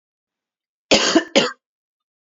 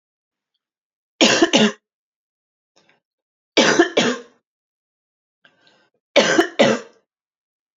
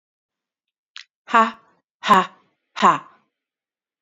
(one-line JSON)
{"cough_length": "2.4 s", "cough_amplitude": 28771, "cough_signal_mean_std_ratio": 0.33, "three_cough_length": "7.8 s", "three_cough_amplitude": 29973, "three_cough_signal_mean_std_ratio": 0.34, "exhalation_length": "4.0 s", "exhalation_amplitude": 28194, "exhalation_signal_mean_std_ratio": 0.28, "survey_phase": "beta (2021-08-13 to 2022-03-07)", "age": "45-64", "gender": "Female", "wearing_mask": "No", "symptom_new_continuous_cough": true, "symptom_runny_or_blocked_nose": true, "symptom_sore_throat": true, "symptom_fatigue": true, "symptom_fever_high_temperature": true, "symptom_headache": true, "symptom_onset": "3 days", "smoker_status": "Never smoked", "respiratory_condition_asthma": false, "respiratory_condition_other": false, "recruitment_source": "Test and Trace", "submission_delay": "2 days", "covid_test_result": "Positive", "covid_test_method": "RT-qPCR", "covid_ct_value": 21.3, "covid_ct_gene": "ORF1ab gene", "covid_ct_mean": 21.8, "covid_viral_load": "71000 copies/ml", "covid_viral_load_category": "Low viral load (10K-1M copies/ml)"}